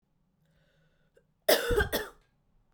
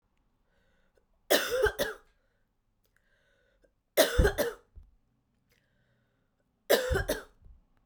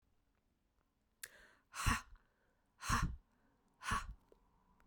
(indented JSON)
{
  "cough_length": "2.7 s",
  "cough_amplitude": 11211,
  "cough_signal_mean_std_ratio": 0.32,
  "three_cough_length": "7.9 s",
  "three_cough_amplitude": 13470,
  "three_cough_signal_mean_std_ratio": 0.32,
  "exhalation_length": "4.9 s",
  "exhalation_amplitude": 2615,
  "exhalation_signal_mean_std_ratio": 0.33,
  "survey_phase": "beta (2021-08-13 to 2022-03-07)",
  "age": "18-44",
  "gender": "Female",
  "wearing_mask": "No",
  "symptom_runny_or_blocked_nose": true,
  "symptom_headache": true,
  "symptom_other": true,
  "symptom_onset": "4 days",
  "smoker_status": "Ex-smoker",
  "respiratory_condition_asthma": false,
  "respiratory_condition_other": false,
  "recruitment_source": "Test and Trace",
  "submission_delay": "1 day",
  "covid_test_result": "Positive",
  "covid_test_method": "RT-qPCR"
}